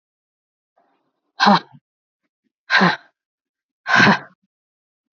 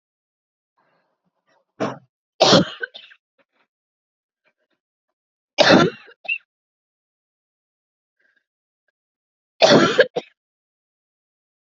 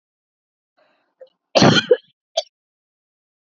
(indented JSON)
{
  "exhalation_length": "5.1 s",
  "exhalation_amplitude": 28244,
  "exhalation_signal_mean_std_ratio": 0.3,
  "three_cough_length": "11.6 s",
  "three_cough_amplitude": 32767,
  "three_cough_signal_mean_std_ratio": 0.24,
  "cough_length": "3.6 s",
  "cough_amplitude": 27695,
  "cough_signal_mean_std_ratio": 0.25,
  "survey_phase": "beta (2021-08-13 to 2022-03-07)",
  "age": "18-44",
  "gender": "Female",
  "wearing_mask": "No",
  "symptom_cough_any": true,
  "symptom_runny_or_blocked_nose": true,
  "symptom_headache": true,
  "symptom_onset": "3 days",
  "smoker_status": "Never smoked",
  "respiratory_condition_asthma": false,
  "respiratory_condition_other": false,
  "recruitment_source": "Test and Trace",
  "submission_delay": "2 days",
  "covid_test_result": "Positive",
  "covid_test_method": "RT-qPCR",
  "covid_ct_value": 20.6,
  "covid_ct_gene": "ORF1ab gene",
  "covid_ct_mean": 21.3,
  "covid_viral_load": "100000 copies/ml",
  "covid_viral_load_category": "Low viral load (10K-1M copies/ml)"
}